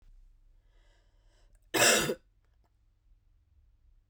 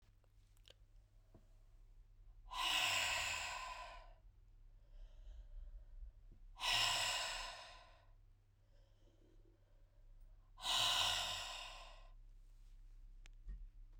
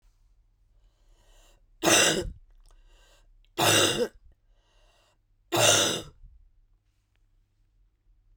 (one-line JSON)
{"cough_length": "4.1 s", "cough_amplitude": 10197, "cough_signal_mean_std_ratio": 0.27, "exhalation_length": "14.0 s", "exhalation_amplitude": 2199, "exhalation_signal_mean_std_ratio": 0.54, "three_cough_length": "8.4 s", "three_cough_amplitude": 18038, "three_cough_signal_mean_std_ratio": 0.34, "survey_phase": "beta (2021-08-13 to 2022-03-07)", "age": "45-64", "gender": "Female", "wearing_mask": "No", "symptom_cough_any": true, "symptom_runny_or_blocked_nose": true, "symptom_fatigue": true, "symptom_fever_high_temperature": true, "symptom_headache": true, "symptom_change_to_sense_of_smell_or_taste": true, "symptom_other": true, "symptom_onset": "3 days", "smoker_status": "Never smoked", "respiratory_condition_asthma": false, "respiratory_condition_other": false, "recruitment_source": "Test and Trace", "submission_delay": "1 day", "covid_test_result": "Positive", "covid_test_method": "RT-qPCR"}